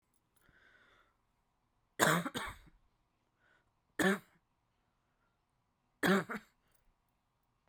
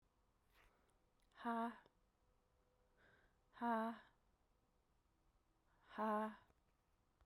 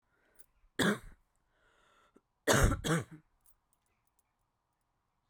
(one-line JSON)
{"three_cough_length": "7.7 s", "three_cough_amplitude": 10097, "three_cough_signal_mean_std_ratio": 0.26, "exhalation_length": "7.3 s", "exhalation_amplitude": 860, "exhalation_signal_mean_std_ratio": 0.34, "cough_length": "5.3 s", "cough_amplitude": 7593, "cough_signal_mean_std_ratio": 0.29, "survey_phase": "beta (2021-08-13 to 2022-03-07)", "age": "18-44", "gender": "Female", "wearing_mask": "No", "symptom_cough_any": true, "symptom_runny_or_blocked_nose": true, "symptom_change_to_sense_of_smell_or_taste": true, "symptom_onset": "12 days", "smoker_status": "Never smoked", "respiratory_condition_asthma": false, "respiratory_condition_other": false, "recruitment_source": "REACT", "submission_delay": "3 days", "covid_test_result": "Negative", "covid_test_method": "RT-qPCR"}